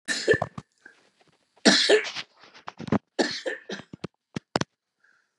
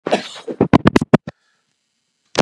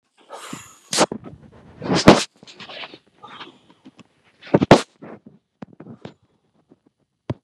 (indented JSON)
{
  "three_cough_length": "5.4 s",
  "three_cough_amplitude": 24843,
  "three_cough_signal_mean_std_ratio": 0.35,
  "cough_length": "2.4 s",
  "cough_amplitude": 32768,
  "cough_signal_mean_std_ratio": 0.29,
  "exhalation_length": "7.4 s",
  "exhalation_amplitude": 32768,
  "exhalation_signal_mean_std_ratio": 0.24,
  "survey_phase": "beta (2021-08-13 to 2022-03-07)",
  "age": "65+",
  "gender": "Male",
  "wearing_mask": "No",
  "symptom_shortness_of_breath": true,
  "symptom_diarrhoea": true,
  "smoker_status": "Never smoked",
  "respiratory_condition_asthma": true,
  "respiratory_condition_other": true,
  "recruitment_source": "REACT",
  "submission_delay": "4 days",
  "covid_test_result": "Negative",
  "covid_test_method": "RT-qPCR",
  "influenza_a_test_result": "Negative",
  "influenza_b_test_result": "Negative"
}